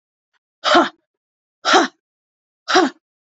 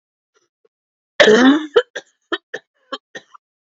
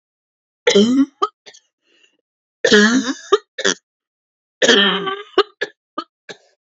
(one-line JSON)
{"exhalation_length": "3.2 s", "exhalation_amplitude": 28220, "exhalation_signal_mean_std_ratio": 0.35, "cough_length": "3.8 s", "cough_amplitude": 32768, "cough_signal_mean_std_ratio": 0.32, "three_cough_length": "6.7 s", "three_cough_amplitude": 30981, "three_cough_signal_mean_std_ratio": 0.41, "survey_phase": "alpha (2021-03-01 to 2021-08-12)", "age": "18-44", "gender": "Female", "wearing_mask": "No", "symptom_fatigue": true, "symptom_onset": "12 days", "smoker_status": "Ex-smoker", "respiratory_condition_asthma": false, "respiratory_condition_other": false, "recruitment_source": "REACT", "submission_delay": "1 day", "covid_test_result": "Negative", "covid_test_method": "RT-qPCR"}